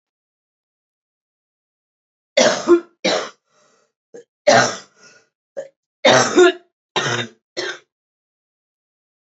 {"three_cough_length": "9.2 s", "three_cough_amplitude": 29703, "three_cough_signal_mean_std_ratio": 0.33, "survey_phase": "beta (2021-08-13 to 2022-03-07)", "age": "18-44", "gender": "Female", "wearing_mask": "No", "symptom_cough_any": true, "symptom_runny_or_blocked_nose": true, "symptom_shortness_of_breath": true, "symptom_sore_throat": true, "symptom_onset": "4 days", "smoker_status": "Current smoker (1 to 10 cigarettes per day)", "respiratory_condition_asthma": false, "respiratory_condition_other": false, "recruitment_source": "Test and Trace", "submission_delay": "1 day", "covid_test_result": "Negative", "covid_test_method": "RT-qPCR"}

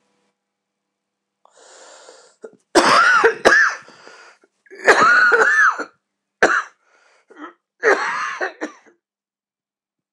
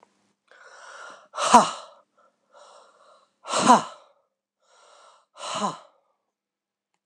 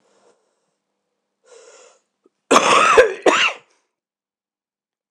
{"three_cough_length": "10.1 s", "three_cough_amplitude": 26028, "three_cough_signal_mean_std_ratio": 0.43, "exhalation_length": "7.1 s", "exhalation_amplitude": 26028, "exhalation_signal_mean_std_ratio": 0.25, "cough_length": "5.1 s", "cough_amplitude": 26028, "cough_signal_mean_std_ratio": 0.33, "survey_phase": "alpha (2021-03-01 to 2021-08-12)", "age": "45-64", "gender": "Male", "wearing_mask": "No", "symptom_cough_any": true, "symptom_fatigue": true, "symptom_headache": true, "symptom_change_to_sense_of_smell_or_taste": true, "symptom_loss_of_taste": true, "symptom_onset": "2 days", "smoker_status": "Never smoked", "respiratory_condition_asthma": true, "respiratory_condition_other": false, "recruitment_source": "Test and Trace", "submission_delay": "2 days", "covid_test_result": "Positive", "covid_test_method": "RT-qPCR", "covid_ct_value": 19.5, "covid_ct_gene": "ORF1ab gene", "covid_ct_mean": 20.2, "covid_viral_load": "240000 copies/ml", "covid_viral_load_category": "Low viral load (10K-1M copies/ml)"}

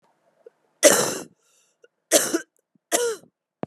{"three_cough_length": "3.7 s", "three_cough_amplitude": 30863, "three_cough_signal_mean_std_ratio": 0.34, "survey_phase": "beta (2021-08-13 to 2022-03-07)", "age": "45-64", "gender": "Female", "wearing_mask": "Yes", "symptom_cough_any": true, "symptom_runny_or_blocked_nose": true, "symptom_shortness_of_breath": true, "symptom_fatigue": true, "symptom_fever_high_temperature": true, "symptom_change_to_sense_of_smell_or_taste": true, "symptom_onset": "3 days", "smoker_status": "Never smoked", "respiratory_condition_asthma": false, "respiratory_condition_other": false, "recruitment_source": "Test and Trace", "submission_delay": "2 days", "covid_test_result": "Positive", "covid_test_method": "RT-qPCR"}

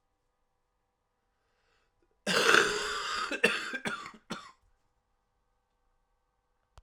{"cough_length": "6.8 s", "cough_amplitude": 17433, "cough_signal_mean_std_ratio": 0.34, "survey_phase": "alpha (2021-03-01 to 2021-08-12)", "age": "18-44", "gender": "Male", "wearing_mask": "No", "symptom_cough_any": true, "symptom_shortness_of_breath": true, "symptom_fatigue": true, "symptom_headache": true, "symptom_loss_of_taste": true, "symptom_onset": "6 days", "smoker_status": "Ex-smoker", "respiratory_condition_asthma": false, "respiratory_condition_other": true, "recruitment_source": "REACT", "submission_delay": "1 day", "covid_test_result": "Positive", "covid_test_method": "RT-qPCR", "covid_ct_value": 21.0, "covid_ct_gene": "N gene"}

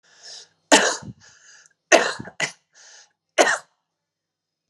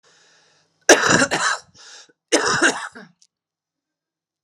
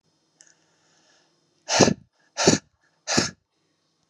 {"three_cough_length": "4.7 s", "three_cough_amplitude": 32767, "three_cough_signal_mean_std_ratio": 0.3, "cough_length": "4.4 s", "cough_amplitude": 32768, "cough_signal_mean_std_ratio": 0.37, "exhalation_length": "4.1 s", "exhalation_amplitude": 29938, "exhalation_signal_mean_std_ratio": 0.28, "survey_phase": "alpha (2021-03-01 to 2021-08-12)", "age": "45-64", "gender": "Female", "wearing_mask": "No", "symptom_cough_any": true, "symptom_fatigue": true, "symptom_change_to_sense_of_smell_or_taste": true, "symptom_loss_of_taste": true, "symptom_onset": "8 days", "smoker_status": "Ex-smoker", "respiratory_condition_asthma": false, "respiratory_condition_other": false, "recruitment_source": "Test and Trace", "submission_delay": "2 days", "covid_test_result": "Positive", "covid_test_method": "RT-qPCR", "covid_ct_value": 16.2, "covid_ct_gene": "ORF1ab gene", "covid_ct_mean": 16.5, "covid_viral_load": "3800000 copies/ml", "covid_viral_load_category": "High viral load (>1M copies/ml)"}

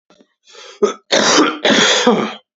{"cough_length": "2.6 s", "cough_amplitude": 32146, "cough_signal_mean_std_ratio": 0.62, "survey_phase": "beta (2021-08-13 to 2022-03-07)", "age": "18-44", "gender": "Male", "wearing_mask": "No", "symptom_cough_any": true, "symptom_new_continuous_cough": true, "symptom_headache": true, "smoker_status": "Never smoked", "respiratory_condition_asthma": false, "respiratory_condition_other": false, "recruitment_source": "Test and Trace", "submission_delay": "2 days", "covid_test_result": "Negative", "covid_test_method": "RT-qPCR"}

